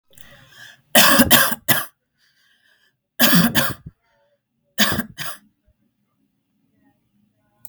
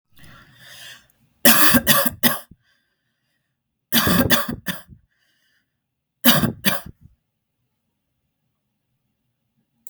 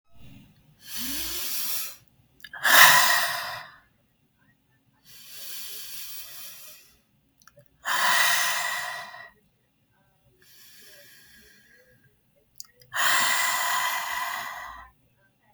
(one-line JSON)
{"cough_length": "7.7 s", "cough_amplitude": 32768, "cough_signal_mean_std_ratio": 0.35, "three_cough_length": "9.9 s", "three_cough_amplitude": 32768, "three_cough_signal_mean_std_ratio": 0.33, "exhalation_length": "15.5 s", "exhalation_amplitude": 32767, "exhalation_signal_mean_std_ratio": 0.42, "survey_phase": "beta (2021-08-13 to 2022-03-07)", "age": "18-44", "gender": "Female", "wearing_mask": "No", "symptom_none": true, "smoker_status": "Current smoker (1 to 10 cigarettes per day)", "respiratory_condition_asthma": false, "respiratory_condition_other": false, "recruitment_source": "REACT", "submission_delay": "1 day", "covid_test_result": "Negative", "covid_test_method": "RT-qPCR", "influenza_a_test_result": "Unknown/Void", "influenza_b_test_result": "Unknown/Void"}